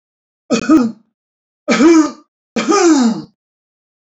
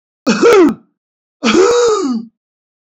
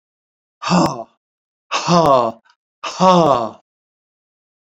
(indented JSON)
{
  "three_cough_length": "4.0 s",
  "three_cough_amplitude": 29727,
  "three_cough_signal_mean_std_ratio": 0.52,
  "cough_length": "2.8 s",
  "cough_amplitude": 29040,
  "cough_signal_mean_std_ratio": 0.62,
  "exhalation_length": "4.6 s",
  "exhalation_amplitude": 29711,
  "exhalation_signal_mean_std_ratio": 0.44,
  "survey_phase": "beta (2021-08-13 to 2022-03-07)",
  "age": "65+",
  "gender": "Male",
  "wearing_mask": "No",
  "symptom_none": true,
  "smoker_status": "Ex-smoker",
  "respiratory_condition_asthma": false,
  "respiratory_condition_other": false,
  "recruitment_source": "REACT",
  "submission_delay": "2 days",
  "covid_test_result": "Negative",
  "covid_test_method": "RT-qPCR"
}